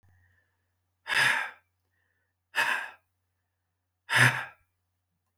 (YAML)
exhalation_length: 5.4 s
exhalation_amplitude: 15178
exhalation_signal_mean_std_ratio: 0.32
survey_phase: beta (2021-08-13 to 2022-03-07)
age: 45-64
gender: Male
wearing_mask: 'No'
symptom_none: true
symptom_onset: 5 days
smoker_status: Never smoked
respiratory_condition_asthma: false
respiratory_condition_other: false
recruitment_source: REACT
submission_delay: 2 days
covid_test_result: Negative
covid_test_method: RT-qPCR